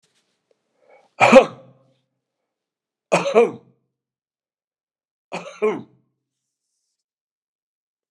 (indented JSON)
{
  "three_cough_length": "8.1 s",
  "three_cough_amplitude": 32768,
  "three_cough_signal_mean_std_ratio": 0.22,
  "survey_phase": "beta (2021-08-13 to 2022-03-07)",
  "age": "65+",
  "gender": "Male",
  "wearing_mask": "No",
  "symptom_cough_any": true,
  "symptom_sore_throat": true,
  "smoker_status": "Ex-smoker",
  "respiratory_condition_asthma": false,
  "respiratory_condition_other": false,
  "recruitment_source": "Test and Trace",
  "submission_delay": "1 day",
  "covid_test_result": "Positive",
  "covid_test_method": "RT-qPCR",
  "covid_ct_value": 18.2,
  "covid_ct_gene": "ORF1ab gene",
  "covid_ct_mean": 18.9,
  "covid_viral_load": "620000 copies/ml",
  "covid_viral_load_category": "Low viral load (10K-1M copies/ml)"
}